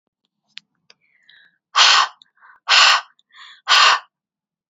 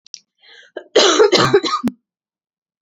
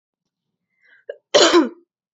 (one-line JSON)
{"exhalation_length": "4.7 s", "exhalation_amplitude": 31584, "exhalation_signal_mean_std_ratio": 0.37, "three_cough_length": "2.8 s", "three_cough_amplitude": 31008, "three_cough_signal_mean_std_ratio": 0.45, "cough_length": "2.1 s", "cough_amplitude": 30191, "cough_signal_mean_std_ratio": 0.32, "survey_phase": "beta (2021-08-13 to 2022-03-07)", "age": "18-44", "gender": "Female", "wearing_mask": "No", "symptom_cough_any": true, "symptom_runny_or_blocked_nose": true, "symptom_sore_throat": true, "symptom_headache": true, "smoker_status": "Never smoked", "respiratory_condition_asthma": false, "respiratory_condition_other": false, "recruitment_source": "Test and Trace", "submission_delay": "2 days", "covid_test_result": "Positive", "covid_test_method": "ePCR"}